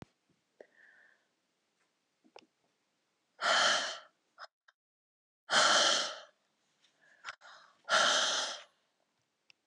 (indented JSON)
{
  "exhalation_length": "9.7 s",
  "exhalation_amplitude": 6710,
  "exhalation_signal_mean_std_ratio": 0.36,
  "survey_phase": "alpha (2021-03-01 to 2021-08-12)",
  "age": "65+",
  "gender": "Female",
  "wearing_mask": "No",
  "symptom_cough_any": true,
  "symptom_onset": "13 days",
  "smoker_status": "Never smoked",
  "respiratory_condition_asthma": false,
  "respiratory_condition_other": true,
  "recruitment_source": "REACT",
  "submission_delay": "2 days",
  "covid_test_result": "Negative",
  "covid_test_method": "RT-qPCR"
}